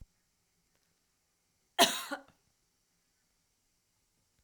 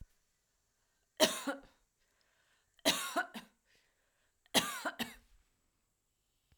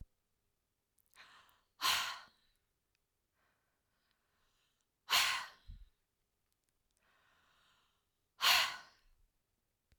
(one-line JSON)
{"cough_length": "4.4 s", "cough_amplitude": 11333, "cough_signal_mean_std_ratio": 0.17, "three_cough_length": "6.6 s", "three_cough_amplitude": 8054, "three_cough_signal_mean_std_ratio": 0.28, "exhalation_length": "10.0 s", "exhalation_amplitude": 4668, "exhalation_signal_mean_std_ratio": 0.25, "survey_phase": "alpha (2021-03-01 to 2021-08-12)", "age": "18-44", "gender": "Female", "wearing_mask": "No", "symptom_none": true, "smoker_status": "Never smoked", "respiratory_condition_asthma": false, "respiratory_condition_other": false, "recruitment_source": "REACT", "submission_delay": "0 days", "covid_test_result": "Negative", "covid_test_method": "RT-qPCR", "covid_ct_value": 41.0, "covid_ct_gene": "N gene"}